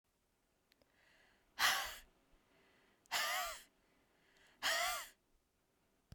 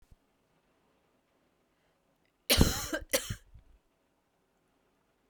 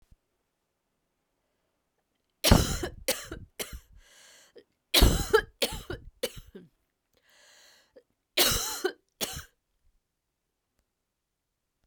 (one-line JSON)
{"exhalation_length": "6.1 s", "exhalation_amplitude": 3411, "exhalation_signal_mean_std_ratio": 0.37, "cough_length": "5.3 s", "cough_amplitude": 14240, "cough_signal_mean_std_ratio": 0.23, "three_cough_length": "11.9 s", "three_cough_amplitude": 20528, "three_cough_signal_mean_std_ratio": 0.28, "survey_phase": "beta (2021-08-13 to 2022-03-07)", "age": "45-64", "gender": "Female", "wearing_mask": "No", "symptom_cough_any": true, "symptom_new_continuous_cough": true, "symptom_runny_or_blocked_nose": true, "symptom_headache": true, "symptom_other": true, "symptom_onset": "4 days", "smoker_status": "Never smoked", "respiratory_condition_asthma": false, "respiratory_condition_other": false, "recruitment_source": "Test and Trace", "submission_delay": "1 day", "covid_test_result": "Positive", "covid_test_method": "RT-qPCR", "covid_ct_value": 23.2, "covid_ct_gene": "ORF1ab gene"}